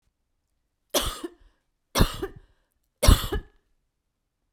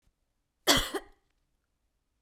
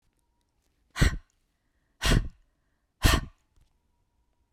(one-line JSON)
{"three_cough_length": "4.5 s", "three_cough_amplitude": 24682, "three_cough_signal_mean_std_ratio": 0.27, "cough_length": "2.2 s", "cough_amplitude": 12935, "cough_signal_mean_std_ratio": 0.25, "exhalation_length": "4.5 s", "exhalation_amplitude": 17257, "exhalation_signal_mean_std_ratio": 0.28, "survey_phase": "beta (2021-08-13 to 2022-03-07)", "age": "45-64", "gender": "Female", "wearing_mask": "No", "symptom_cough_any": true, "symptom_runny_or_blocked_nose": true, "symptom_sore_throat": true, "symptom_fatigue": true, "symptom_onset": "12 days", "smoker_status": "Never smoked", "respiratory_condition_asthma": true, "respiratory_condition_other": false, "recruitment_source": "REACT", "submission_delay": "2 days", "covid_test_result": "Negative", "covid_test_method": "RT-qPCR", "influenza_a_test_result": "Negative", "influenza_b_test_result": "Negative"}